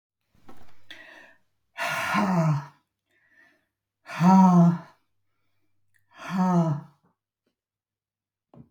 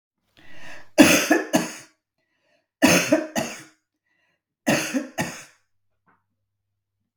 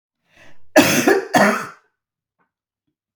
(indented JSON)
{
  "exhalation_length": "8.7 s",
  "exhalation_amplitude": 14235,
  "exhalation_signal_mean_std_ratio": 0.4,
  "three_cough_length": "7.2 s",
  "three_cough_amplitude": 32768,
  "three_cough_signal_mean_std_ratio": 0.36,
  "cough_length": "3.2 s",
  "cough_amplitude": 32768,
  "cough_signal_mean_std_ratio": 0.4,
  "survey_phase": "beta (2021-08-13 to 2022-03-07)",
  "age": "65+",
  "gender": "Female",
  "wearing_mask": "No",
  "symptom_cough_any": true,
  "symptom_fatigue": true,
  "symptom_onset": "12 days",
  "smoker_status": "Ex-smoker",
  "respiratory_condition_asthma": false,
  "respiratory_condition_other": false,
  "recruitment_source": "REACT",
  "submission_delay": "2 days",
  "covid_test_result": "Negative",
  "covid_test_method": "RT-qPCR"
}